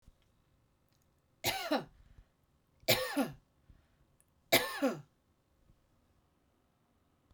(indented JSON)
{
  "three_cough_length": "7.3 s",
  "three_cough_amplitude": 8681,
  "three_cough_signal_mean_std_ratio": 0.3,
  "survey_phase": "beta (2021-08-13 to 2022-03-07)",
  "age": "65+",
  "gender": "Female",
  "wearing_mask": "No",
  "symptom_none": true,
  "smoker_status": "Never smoked",
  "respiratory_condition_asthma": false,
  "respiratory_condition_other": false,
  "recruitment_source": "REACT",
  "submission_delay": "2 days",
  "covid_test_result": "Negative",
  "covid_test_method": "RT-qPCR",
  "influenza_a_test_result": "Negative",
  "influenza_b_test_result": "Negative"
}